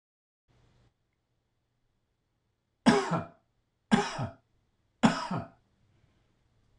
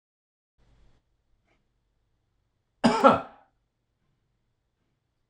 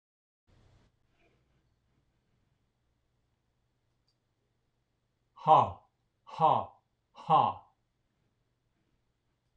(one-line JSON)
{"three_cough_length": "6.8 s", "three_cough_amplitude": 12827, "three_cough_signal_mean_std_ratio": 0.27, "cough_length": "5.3 s", "cough_amplitude": 22343, "cough_signal_mean_std_ratio": 0.19, "exhalation_length": "9.6 s", "exhalation_amplitude": 11426, "exhalation_signal_mean_std_ratio": 0.21, "survey_phase": "beta (2021-08-13 to 2022-03-07)", "age": "65+", "gender": "Male", "wearing_mask": "No", "symptom_none": true, "smoker_status": "Ex-smoker", "respiratory_condition_asthma": false, "respiratory_condition_other": false, "recruitment_source": "REACT", "submission_delay": "1 day", "covid_test_result": "Negative", "covid_test_method": "RT-qPCR"}